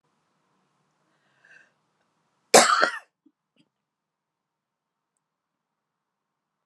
{"cough_length": "6.7 s", "cough_amplitude": 30128, "cough_signal_mean_std_ratio": 0.17, "survey_phase": "beta (2021-08-13 to 2022-03-07)", "age": "45-64", "gender": "Female", "wearing_mask": "Yes", "symptom_none": true, "smoker_status": "Ex-smoker", "respiratory_condition_asthma": false, "respiratory_condition_other": false, "recruitment_source": "REACT", "submission_delay": "1 day", "covid_test_result": "Negative", "covid_test_method": "RT-qPCR"}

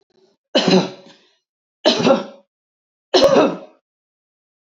{"three_cough_length": "4.6 s", "three_cough_amplitude": 28442, "three_cough_signal_mean_std_ratio": 0.4, "survey_phase": "beta (2021-08-13 to 2022-03-07)", "age": "45-64", "gender": "Female", "wearing_mask": "No", "symptom_none": true, "smoker_status": "Ex-smoker", "respiratory_condition_asthma": false, "respiratory_condition_other": false, "recruitment_source": "REACT", "submission_delay": "1 day", "covid_test_result": "Negative", "covid_test_method": "RT-qPCR", "covid_ct_value": 38.9, "covid_ct_gene": "N gene", "influenza_a_test_result": "Negative", "influenza_b_test_result": "Negative"}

